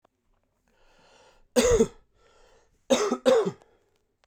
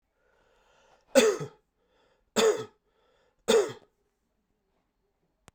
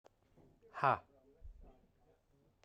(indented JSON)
{
  "cough_length": "4.3 s",
  "cough_amplitude": 15608,
  "cough_signal_mean_std_ratio": 0.36,
  "three_cough_length": "5.5 s",
  "three_cough_amplitude": 15979,
  "three_cough_signal_mean_std_ratio": 0.28,
  "exhalation_length": "2.6 s",
  "exhalation_amplitude": 4243,
  "exhalation_signal_mean_std_ratio": 0.23,
  "survey_phase": "beta (2021-08-13 to 2022-03-07)",
  "age": "18-44",
  "gender": "Male",
  "wearing_mask": "No",
  "symptom_cough_any": true,
  "symptom_runny_or_blocked_nose": true,
  "symptom_change_to_sense_of_smell_or_taste": true,
  "symptom_onset": "4 days",
  "smoker_status": "Never smoked",
  "respiratory_condition_asthma": false,
  "respiratory_condition_other": false,
  "recruitment_source": "Test and Trace",
  "submission_delay": "1 day",
  "covid_test_result": "Positive",
  "covid_test_method": "RT-qPCR",
  "covid_ct_value": 12.5,
  "covid_ct_gene": "ORF1ab gene",
  "covid_ct_mean": 13.0,
  "covid_viral_load": "54000000 copies/ml",
  "covid_viral_load_category": "High viral load (>1M copies/ml)"
}